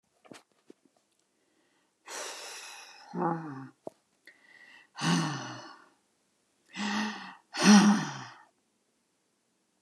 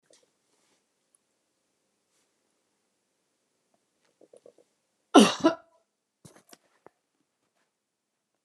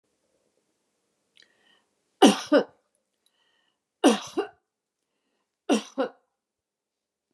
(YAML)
exhalation_length: 9.8 s
exhalation_amplitude: 13131
exhalation_signal_mean_std_ratio: 0.32
cough_length: 8.4 s
cough_amplitude: 27968
cough_signal_mean_std_ratio: 0.13
three_cough_length: 7.3 s
three_cough_amplitude: 27893
three_cough_signal_mean_std_ratio: 0.23
survey_phase: beta (2021-08-13 to 2022-03-07)
age: 65+
gender: Female
wearing_mask: 'No'
symptom_none: true
smoker_status: Never smoked
respiratory_condition_asthma: false
respiratory_condition_other: false
recruitment_source: REACT
submission_delay: 1 day
covid_test_result: Negative
covid_test_method: RT-qPCR